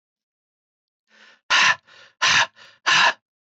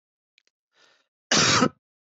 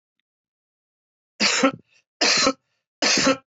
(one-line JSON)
{"exhalation_length": "3.5 s", "exhalation_amplitude": 17176, "exhalation_signal_mean_std_ratio": 0.39, "cough_length": "2.0 s", "cough_amplitude": 17937, "cough_signal_mean_std_ratio": 0.35, "three_cough_length": "3.5 s", "three_cough_amplitude": 19911, "three_cough_signal_mean_std_ratio": 0.44, "survey_phase": "beta (2021-08-13 to 2022-03-07)", "age": "45-64", "gender": "Male", "wearing_mask": "No", "symptom_fatigue": true, "symptom_onset": "6 days", "smoker_status": "Never smoked", "respiratory_condition_asthma": false, "respiratory_condition_other": false, "recruitment_source": "REACT", "submission_delay": "1 day", "covid_test_result": "Negative", "covid_test_method": "RT-qPCR"}